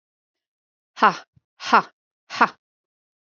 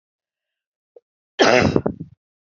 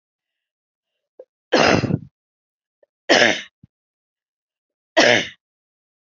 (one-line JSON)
{"exhalation_length": "3.2 s", "exhalation_amplitude": 28383, "exhalation_signal_mean_std_ratio": 0.23, "cough_length": "2.5 s", "cough_amplitude": 32229, "cough_signal_mean_std_ratio": 0.32, "three_cough_length": "6.1 s", "three_cough_amplitude": 32767, "three_cough_signal_mean_std_ratio": 0.3, "survey_phase": "alpha (2021-03-01 to 2021-08-12)", "age": "45-64", "gender": "Female", "wearing_mask": "No", "symptom_cough_any": true, "smoker_status": "Ex-smoker", "respiratory_condition_asthma": false, "respiratory_condition_other": false, "recruitment_source": "REACT", "submission_delay": "1 day", "covid_test_result": "Negative", "covid_test_method": "RT-qPCR"}